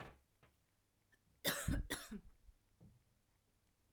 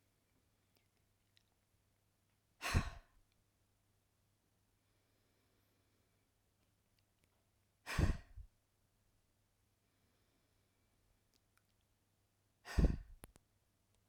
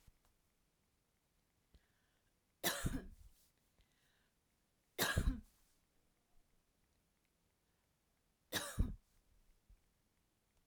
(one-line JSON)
{"cough_length": "3.9 s", "cough_amplitude": 2274, "cough_signal_mean_std_ratio": 0.35, "exhalation_length": "14.1 s", "exhalation_amplitude": 3650, "exhalation_signal_mean_std_ratio": 0.19, "three_cough_length": "10.7 s", "three_cough_amplitude": 2950, "three_cough_signal_mean_std_ratio": 0.26, "survey_phase": "alpha (2021-03-01 to 2021-08-12)", "age": "45-64", "gender": "Female", "wearing_mask": "No", "symptom_none": true, "smoker_status": "Never smoked", "respiratory_condition_asthma": false, "respiratory_condition_other": false, "recruitment_source": "REACT", "submission_delay": "2 days", "covid_test_result": "Negative", "covid_test_method": "RT-qPCR"}